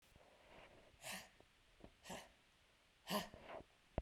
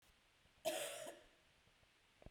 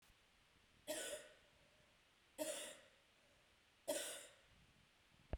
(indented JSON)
{
  "exhalation_length": "4.0 s",
  "exhalation_amplitude": 1929,
  "exhalation_signal_mean_std_ratio": 0.4,
  "cough_length": "2.3 s",
  "cough_amplitude": 1392,
  "cough_signal_mean_std_ratio": 0.42,
  "three_cough_length": "5.4 s",
  "three_cough_amplitude": 1027,
  "three_cough_signal_mean_std_ratio": 0.43,
  "survey_phase": "beta (2021-08-13 to 2022-03-07)",
  "age": "45-64",
  "gender": "Female",
  "wearing_mask": "No",
  "symptom_fatigue": true,
  "symptom_onset": "2 days",
  "smoker_status": "Never smoked",
  "respiratory_condition_asthma": false,
  "respiratory_condition_other": true,
  "recruitment_source": "Test and Trace",
  "submission_delay": "1 day",
  "covid_test_result": "Positive",
  "covid_test_method": "RT-qPCR",
  "covid_ct_value": 20.3,
  "covid_ct_gene": "ORF1ab gene",
  "covid_ct_mean": 21.1,
  "covid_viral_load": "120000 copies/ml",
  "covid_viral_load_category": "Low viral load (10K-1M copies/ml)"
}